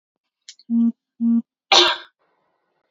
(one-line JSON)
{"cough_length": "2.9 s", "cough_amplitude": 28963, "cough_signal_mean_std_ratio": 0.41, "survey_phase": "alpha (2021-03-01 to 2021-08-12)", "age": "18-44", "gender": "Female", "wearing_mask": "No", "symptom_none": true, "smoker_status": "Never smoked", "respiratory_condition_asthma": false, "respiratory_condition_other": false, "recruitment_source": "REACT", "submission_delay": "2 days", "covid_test_result": "Negative", "covid_test_method": "RT-qPCR"}